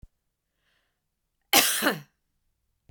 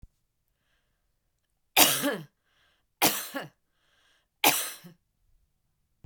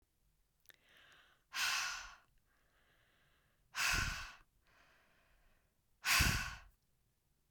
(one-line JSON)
{"cough_length": "2.9 s", "cough_amplitude": 23302, "cough_signal_mean_std_ratio": 0.28, "three_cough_length": "6.1 s", "three_cough_amplitude": 23172, "three_cough_signal_mean_std_ratio": 0.28, "exhalation_length": "7.5 s", "exhalation_amplitude": 3557, "exhalation_signal_mean_std_ratio": 0.36, "survey_phase": "beta (2021-08-13 to 2022-03-07)", "age": "45-64", "gender": "Female", "wearing_mask": "No", "symptom_none": true, "smoker_status": "Never smoked", "respiratory_condition_asthma": false, "respiratory_condition_other": false, "recruitment_source": "REACT", "submission_delay": "11 days", "covid_test_result": "Negative", "covid_test_method": "RT-qPCR", "influenza_a_test_result": "Negative", "influenza_b_test_result": "Negative"}